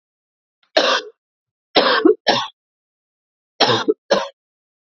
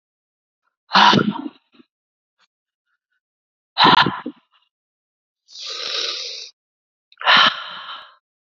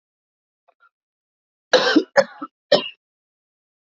{"cough_length": "4.9 s", "cough_amplitude": 29786, "cough_signal_mean_std_ratio": 0.39, "exhalation_length": "8.5 s", "exhalation_amplitude": 32768, "exhalation_signal_mean_std_ratio": 0.33, "three_cough_length": "3.8 s", "three_cough_amplitude": 27301, "three_cough_signal_mean_std_ratio": 0.27, "survey_phase": "beta (2021-08-13 to 2022-03-07)", "age": "18-44", "gender": "Male", "wearing_mask": "No", "symptom_cough_any": true, "symptom_new_continuous_cough": true, "symptom_runny_or_blocked_nose": true, "symptom_sore_throat": true, "symptom_diarrhoea": true, "symptom_fatigue": true, "symptom_headache": true, "symptom_onset": "4 days", "smoker_status": "Ex-smoker", "respiratory_condition_asthma": false, "respiratory_condition_other": false, "recruitment_source": "Test and Trace", "submission_delay": "2 days", "covid_test_result": "Positive", "covid_test_method": "RT-qPCR", "covid_ct_value": 12.0, "covid_ct_gene": "ORF1ab gene", "covid_ct_mean": 12.2, "covid_viral_load": "99000000 copies/ml", "covid_viral_load_category": "High viral load (>1M copies/ml)"}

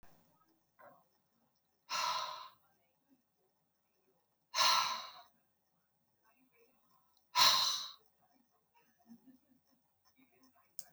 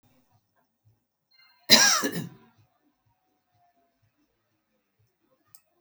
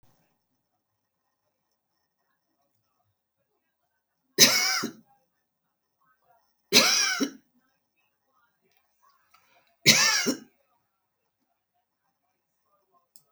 {"exhalation_length": "10.9 s", "exhalation_amplitude": 6720, "exhalation_signal_mean_std_ratio": 0.28, "cough_length": "5.8 s", "cough_amplitude": 32767, "cough_signal_mean_std_ratio": 0.21, "three_cough_length": "13.3 s", "three_cough_amplitude": 26772, "three_cough_signal_mean_std_ratio": 0.25, "survey_phase": "beta (2021-08-13 to 2022-03-07)", "age": "65+", "gender": "Female", "wearing_mask": "No", "symptom_none": true, "smoker_status": "Current smoker (1 to 10 cigarettes per day)", "respiratory_condition_asthma": false, "respiratory_condition_other": false, "recruitment_source": "REACT", "submission_delay": "3 days", "covid_test_result": "Negative", "covid_test_method": "RT-qPCR"}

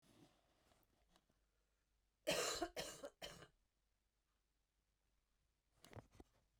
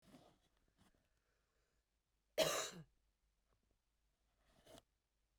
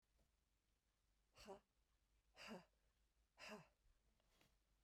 {"three_cough_length": "6.6 s", "three_cough_amplitude": 1116, "three_cough_signal_mean_std_ratio": 0.29, "cough_length": "5.4 s", "cough_amplitude": 2332, "cough_signal_mean_std_ratio": 0.22, "exhalation_length": "4.8 s", "exhalation_amplitude": 201, "exhalation_signal_mean_std_ratio": 0.41, "survey_phase": "beta (2021-08-13 to 2022-03-07)", "age": "45-64", "gender": "Female", "wearing_mask": "No", "symptom_cough_any": true, "symptom_runny_or_blocked_nose": true, "symptom_headache": true, "symptom_onset": "2 days", "smoker_status": "Never smoked", "respiratory_condition_asthma": false, "respiratory_condition_other": true, "recruitment_source": "Test and Trace", "submission_delay": "1 day", "covid_test_result": "Negative", "covid_test_method": "RT-qPCR"}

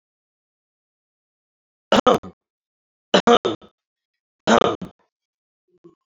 {"three_cough_length": "6.1 s", "three_cough_amplitude": 29959, "three_cough_signal_mean_std_ratio": 0.25, "survey_phase": "beta (2021-08-13 to 2022-03-07)", "age": "45-64", "gender": "Male", "wearing_mask": "No", "symptom_cough_any": true, "symptom_runny_or_blocked_nose": true, "smoker_status": "Ex-smoker", "respiratory_condition_asthma": false, "respiratory_condition_other": false, "recruitment_source": "Test and Trace", "submission_delay": "2 days", "covid_test_result": "Positive", "covid_test_method": "RT-qPCR", "covid_ct_value": 20.8, "covid_ct_gene": "N gene", "covid_ct_mean": 21.7, "covid_viral_load": "78000 copies/ml", "covid_viral_load_category": "Low viral load (10K-1M copies/ml)"}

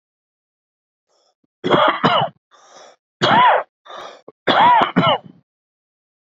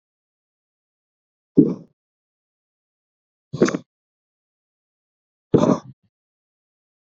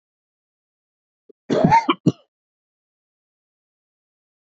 {"three_cough_length": "6.2 s", "three_cough_amplitude": 32767, "three_cough_signal_mean_std_ratio": 0.44, "exhalation_length": "7.2 s", "exhalation_amplitude": 28407, "exhalation_signal_mean_std_ratio": 0.2, "cough_length": "4.5 s", "cough_amplitude": 26313, "cough_signal_mean_std_ratio": 0.24, "survey_phase": "beta (2021-08-13 to 2022-03-07)", "age": "45-64", "gender": "Male", "wearing_mask": "No", "symptom_cough_any": true, "symptom_runny_or_blocked_nose": true, "symptom_other": true, "symptom_onset": "3 days", "smoker_status": "Ex-smoker", "respiratory_condition_asthma": false, "respiratory_condition_other": false, "recruitment_source": "Test and Trace", "submission_delay": "2 days", "covid_test_result": "Positive", "covid_test_method": "RT-qPCR"}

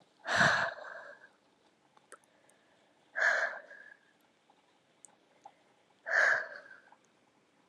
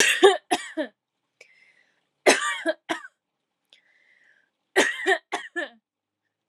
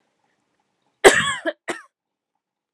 {"exhalation_length": "7.7 s", "exhalation_amplitude": 6372, "exhalation_signal_mean_std_ratio": 0.35, "three_cough_length": "6.5 s", "three_cough_amplitude": 29986, "three_cough_signal_mean_std_ratio": 0.34, "cough_length": "2.7 s", "cough_amplitude": 32768, "cough_signal_mean_std_ratio": 0.25, "survey_phase": "alpha (2021-03-01 to 2021-08-12)", "age": "18-44", "gender": "Female", "wearing_mask": "No", "symptom_shortness_of_breath": true, "symptom_fatigue": true, "symptom_headache": true, "smoker_status": "Never smoked", "respiratory_condition_asthma": false, "respiratory_condition_other": false, "recruitment_source": "Test and Trace", "submission_delay": "2 days", "covid_test_result": "Positive", "covid_test_method": "RT-qPCR"}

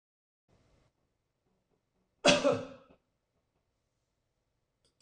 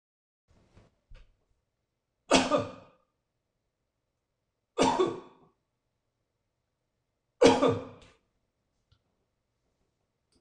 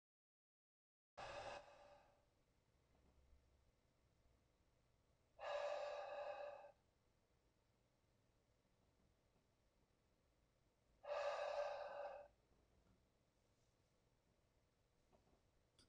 {"cough_length": "5.0 s", "cough_amplitude": 12997, "cough_signal_mean_std_ratio": 0.2, "three_cough_length": "10.4 s", "three_cough_amplitude": 14607, "three_cough_signal_mean_std_ratio": 0.24, "exhalation_length": "15.9 s", "exhalation_amplitude": 572, "exhalation_signal_mean_std_ratio": 0.39, "survey_phase": "beta (2021-08-13 to 2022-03-07)", "age": "65+", "gender": "Male", "wearing_mask": "No", "symptom_none": true, "smoker_status": "Ex-smoker", "respiratory_condition_asthma": false, "respiratory_condition_other": false, "recruitment_source": "REACT", "submission_delay": "3 days", "covid_test_result": "Negative", "covid_test_method": "RT-qPCR"}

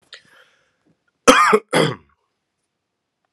{"cough_length": "3.3 s", "cough_amplitude": 32768, "cough_signal_mean_std_ratio": 0.3, "survey_phase": "beta (2021-08-13 to 2022-03-07)", "age": "18-44", "gender": "Male", "wearing_mask": "No", "symptom_sore_throat": true, "smoker_status": "Ex-smoker", "respiratory_condition_asthma": false, "respiratory_condition_other": false, "recruitment_source": "Test and Trace", "submission_delay": "5 days", "covid_test_result": "Negative", "covid_test_method": "RT-qPCR"}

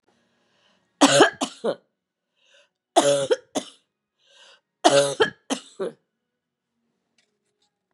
{"three_cough_length": "7.9 s", "three_cough_amplitude": 32748, "three_cough_signal_mean_std_ratio": 0.31, "survey_phase": "beta (2021-08-13 to 2022-03-07)", "age": "45-64", "gender": "Female", "wearing_mask": "No", "symptom_cough_any": true, "symptom_runny_or_blocked_nose": true, "symptom_fatigue": true, "symptom_onset": "2 days", "smoker_status": "Ex-smoker", "respiratory_condition_asthma": false, "respiratory_condition_other": false, "recruitment_source": "Test and Trace", "submission_delay": "1 day", "covid_test_result": "Positive", "covid_test_method": "RT-qPCR", "covid_ct_value": 21.3, "covid_ct_gene": "N gene"}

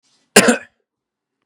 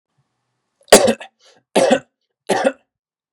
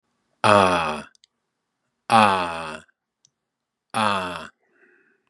{"cough_length": "1.5 s", "cough_amplitude": 32768, "cough_signal_mean_std_ratio": 0.28, "three_cough_length": "3.3 s", "three_cough_amplitude": 32768, "three_cough_signal_mean_std_ratio": 0.32, "exhalation_length": "5.3 s", "exhalation_amplitude": 32694, "exhalation_signal_mean_std_ratio": 0.35, "survey_phase": "beta (2021-08-13 to 2022-03-07)", "age": "45-64", "gender": "Male", "wearing_mask": "No", "symptom_runny_or_blocked_nose": true, "symptom_headache": true, "symptom_change_to_sense_of_smell_or_taste": true, "symptom_loss_of_taste": true, "symptom_onset": "3 days", "smoker_status": "Never smoked", "respiratory_condition_asthma": false, "respiratory_condition_other": false, "recruitment_source": "Test and Trace", "submission_delay": "1 day", "covid_test_result": "Positive", "covid_test_method": "RT-qPCR"}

